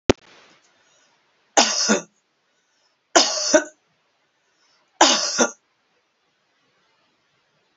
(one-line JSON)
{"three_cough_length": "7.8 s", "three_cough_amplitude": 30743, "three_cough_signal_mean_std_ratio": 0.3, "survey_phase": "beta (2021-08-13 to 2022-03-07)", "age": "65+", "gender": "Female", "wearing_mask": "No", "symptom_none": true, "smoker_status": "Ex-smoker", "respiratory_condition_asthma": true, "respiratory_condition_other": false, "recruitment_source": "Test and Trace", "submission_delay": "1 day", "covid_test_result": "Negative", "covid_test_method": "RT-qPCR"}